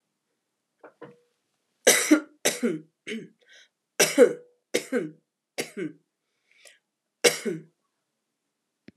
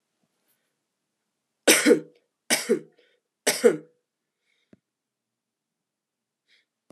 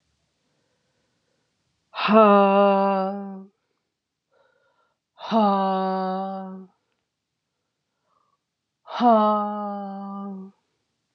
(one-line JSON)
{"cough_length": "9.0 s", "cough_amplitude": 21415, "cough_signal_mean_std_ratio": 0.29, "three_cough_length": "6.9 s", "three_cough_amplitude": 25784, "three_cough_signal_mean_std_ratio": 0.24, "exhalation_length": "11.1 s", "exhalation_amplitude": 25143, "exhalation_signal_mean_std_ratio": 0.42, "survey_phase": "alpha (2021-03-01 to 2021-08-12)", "age": "45-64", "gender": "Male", "wearing_mask": "No", "symptom_fatigue": true, "symptom_fever_high_temperature": true, "symptom_headache": true, "symptom_onset": "5 days", "smoker_status": "Never smoked", "respiratory_condition_asthma": false, "respiratory_condition_other": false, "recruitment_source": "Test and Trace", "submission_delay": "2 days", "covid_test_result": "Positive", "covid_test_method": "RT-qPCR", "covid_ct_value": 17.1, "covid_ct_gene": "ORF1ab gene", "covid_ct_mean": 17.9, "covid_viral_load": "1300000 copies/ml", "covid_viral_load_category": "High viral load (>1M copies/ml)"}